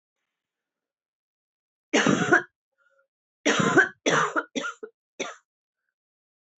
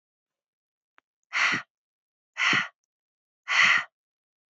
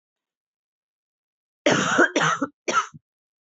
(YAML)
three_cough_length: 6.6 s
three_cough_amplitude: 15569
three_cough_signal_mean_std_ratio: 0.36
exhalation_length: 4.5 s
exhalation_amplitude: 13672
exhalation_signal_mean_std_ratio: 0.35
cough_length: 3.6 s
cough_amplitude: 18082
cough_signal_mean_std_ratio: 0.39
survey_phase: beta (2021-08-13 to 2022-03-07)
age: 18-44
gender: Female
wearing_mask: 'No'
symptom_cough_any: true
symptom_runny_or_blocked_nose: true
symptom_shortness_of_breath: true
symptom_fatigue: true
symptom_change_to_sense_of_smell_or_taste: true
smoker_status: Never smoked
respiratory_condition_asthma: false
respiratory_condition_other: false
recruitment_source: Test and Trace
submission_delay: 1 day
covid_test_result: Positive
covid_test_method: RT-qPCR
covid_ct_value: 22.8
covid_ct_gene: ORF1ab gene
covid_ct_mean: 23.2
covid_viral_load: 25000 copies/ml
covid_viral_load_category: Low viral load (10K-1M copies/ml)